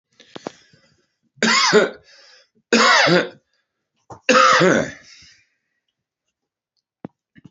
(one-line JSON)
{"three_cough_length": "7.5 s", "three_cough_amplitude": 28804, "three_cough_signal_mean_std_ratio": 0.39, "survey_phase": "alpha (2021-03-01 to 2021-08-12)", "age": "65+", "gender": "Male", "wearing_mask": "No", "symptom_cough_any": true, "symptom_onset": "3 days", "smoker_status": "Ex-smoker", "respiratory_condition_asthma": false, "respiratory_condition_other": false, "recruitment_source": "Test and Trace", "submission_delay": "2 days", "covid_test_result": "Positive", "covid_test_method": "RT-qPCR"}